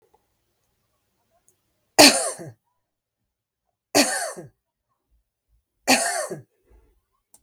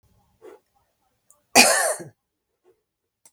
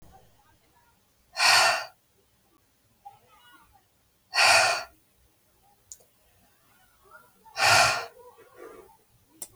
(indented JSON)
{
  "three_cough_length": "7.4 s",
  "three_cough_amplitude": 32766,
  "three_cough_signal_mean_std_ratio": 0.25,
  "cough_length": "3.3 s",
  "cough_amplitude": 32768,
  "cough_signal_mean_std_ratio": 0.26,
  "exhalation_length": "9.6 s",
  "exhalation_amplitude": 16778,
  "exhalation_signal_mean_std_ratio": 0.32,
  "survey_phase": "beta (2021-08-13 to 2022-03-07)",
  "age": "45-64",
  "gender": "Female",
  "wearing_mask": "No",
  "symptom_none": true,
  "smoker_status": "Prefer not to say",
  "respiratory_condition_asthma": false,
  "respiratory_condition_other": false,
  "recruitment_source": "REACT",
  "submission_delay": "1 day",
  "covid_test_result": "Negative",
  "covid_test_method": "RT-qPCR",
  "influenza_a_test_result": "Negative",
  "influenza_b_test_result": "Negative"
}